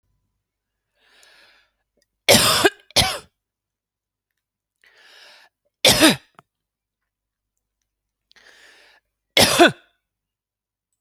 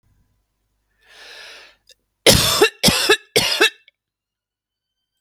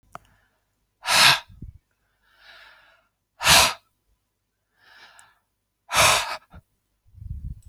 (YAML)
three_cough_length: 11.0 s
three_cough_amplitude: 32768
three_cough_signal_mean_std_ratio: 0.25
cough_length: 5.2 s
cough_amplitude: 32768
cough_signal_mean_std_ratio: 0.35
exhalation_length: 7.7 s
exhalation_amplitude: 24648
exhalation_signal_mean_std_ratio: 0.3
survey_phase: alpha (2021-03-01 to 2021-08-12)
age: 45-64
gender: Female
wearing_mask: 'No'
symptom_none: true
smoker_status: Current smoker (1 to 10 cigarettes per day)
respiratory_condition_asthma: false
respiratory_condition_other: false
recruitment_source: REACT
submission_delay: 4 days
covid_test_result: Negative
covid_test_method: RT-qPCR